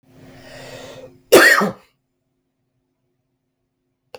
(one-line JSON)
{"cough_length": "4.2 s", "cough_amplitude": 32768, "cough_signal_mean_std_ratio": 0.26, "survey_phase": "beta (2021-08-13 to 2022-03-07)", "age": "18-44", "gender": "Male", "wearing_mask": "No", "symptom_none": true, "smoker_status": "Current smoker (e-cigarettes or vapes only)", "respiratory_condition_asthma": false, "respiratory_condition_other": false, "recruitment_source": "REACT", "submission_delay": "1 day", "covid_test_result": "Negative", "covid_test_method": "RT-qPCR"}